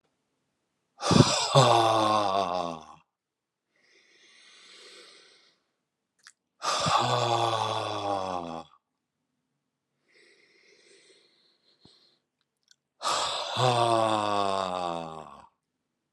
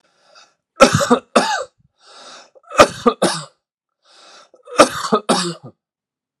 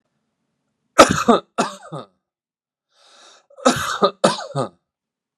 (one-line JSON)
{"exhalation_length": "16.1 s", "exhalation_amplitude": 20772, "exhalation_signal_mean_std_ratio": 0.44, "three_cough_length": "6.4 s", "three_cough_amplitude": 32768, "three_cough_signal_mean_std_ratio": 0.35, "cough_length": "5.4 s", "cough_amplitude": 32768, "cough_signal_mean_std_ratio": 0.31, "survey_phase": "alpha (2021-03-01 to 2021-08-12)", "age": "45-64", "gender": "Male", "wearing_mask": "No", "symptom_none": true, "smoker_status": "Never smoked", "respiratory_condition_asthma": false, "respiratory_condition_other": false, "recruitment_source": "REACT", "submission_delay": "1 day", "covid_test_result": "Negative", "covid_test_method": "RT-qPCR"}